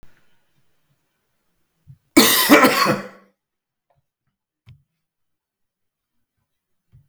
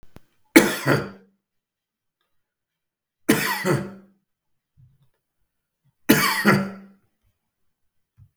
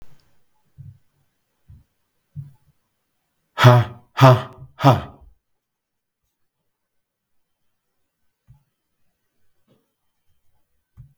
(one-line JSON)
{"cough_length": "7.1 s", "cough_amplitude": 32768, "cough_signal_mean_std_ratio": 0.26, "three_cough_length": "8.4 s", "three_cough_amplitude": 32768, "three_cough_signal_mean_std_ratio": 0.31, "exhalation_length": "11.2 s", "exhalation_amplitude": 32768, "exhalation_signal_mean_std_ratio": 0.2, "survey_phase": "beta (2021-08-13 to 2022-03-07)", "age": "45-64", "gender": "Male", "wearing_mask": "No", "symptom_none": true, "smoker_status": "Never smoked", "respiratory_condition_asthma": false, "respiratory_condition_other": false, "recruitment_source": "REACT", "submission_delay": "2 days", "covid_test_result": "Negative", "covid_test_method": "RT-qPCR", "influenza_a_test_result": "Negative", "influenza_b_test_result": "Negative"}